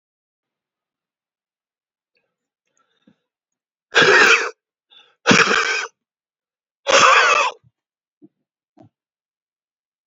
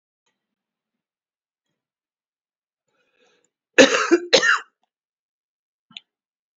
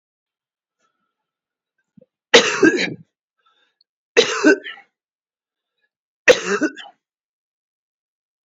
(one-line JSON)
{"exhalation_length": "10.1 s", "exhalation_amplitude": 29790, "exhalation_signal_mean_std_ratio": 0.32, "cough_length": "6.6 s", "cough_amplitude": 28410, "cough_signal_mean_std_ratio": 0.22, "three_cough_length": "8.4 s", "three_cough_amplitude": 31745, "three_cough_signal_mean_std_ratio": 0.27, "survey_phase": "beta (2021-08-13 to 2022-03-07)", "age": "65+", "gender": "Male", "wearing_mask": "No", "symptom_none": true, "smoker_status": "Ex-smoker", "respiratory_condition_asthma": false, "respiratory_condition_other": false, "recruitment_source": "REACT", "submission_delay": "-1 day", "covid_test_result": "Negative", "covid_test_method": "RT-qPCR", "influenza_a_test_result": "Negative", "influenza_b_test_result": "Negative"}